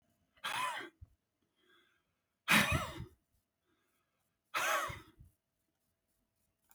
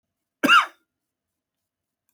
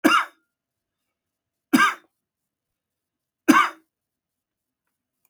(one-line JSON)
{"exhalation_length": "6.7 s", "exhalation_amplitude": 7555, "exhalation_signal_mean_std_ratio": 0.32, "cough_length": "2.1 s", "cough_amplitude": 20009, "cough_signal_mean_std_ratio": 0.25, "three_cough_length": "5.3 s", "three_cough_amplitude": 29471, "three_cough_signal_mean_std_ratio": 0.26, "survey_phase": "beta (2021-08-13 to 2022-03-07)", "age": "65+", "gender": "Male", "wearing_mask": "No", "symptom_none": true, "smoker_status": "Never smoked", "respiratory_condition_asthma": false, "respiratory_condition_other": false, "recruitment_source": "REACT", "submission_delay": "2 days", "covid_test_result": "Negative", "covid_test_method": "RT-qPCR", "influenza_a_test_result": "Negative", "influenza_b_test_result": "Negative"}